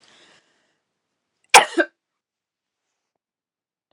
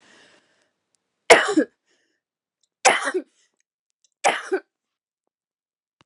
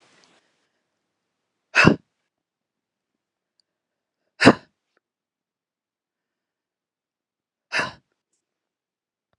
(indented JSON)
{
  "cough_length": "3.9 s",
  "cough_amplitude": 32768,
  "cough_signal_mean_std_ratio": 0.15,
  "three_cough_length": "6.1 s",
  "three_cough_amplitude": 32768,
  "three_cough_signal_mean_std_ratio": 0.25,
  "exhalation_length": "9.4 s",
  "exhalation_amplitude": 32768,
  "exhalation_signal_mean_std_ratio": 0.15,
  "survey_phase": "beta (2021-08-13 to 2022-03-07)",
  "age": "45-64",
  "gender": "Female",
  "wearing_mask": "No",
  "symptom_cough_any": true,
  "symptom_sore_throat": true,
  "symptom_fatigue": true,
  "symptom_fever_high_temperature": true,
  "symptom_headache": true,
  "symptom_other": true,
  "smoker_status": "Never smoked",
  "respiratory_condition_asthma": false,
  "respiratory_condition_other": false,
  "recruitment_source": "Test and Trace",
  "submission_delay": "2 days",
  "covid_test_result": "Positive",
  "covid_test_method": "RT-qPCR",
  "covid_ct_value": 22.2,
  "covid_ct_gene": "N gene",
  "covid_ct_mean": 22.5,
  "covid_viral_load": "41000 copies/ml",
  "covid_viral_load_category": "Low viral load (10K-1M copies/ml)"
}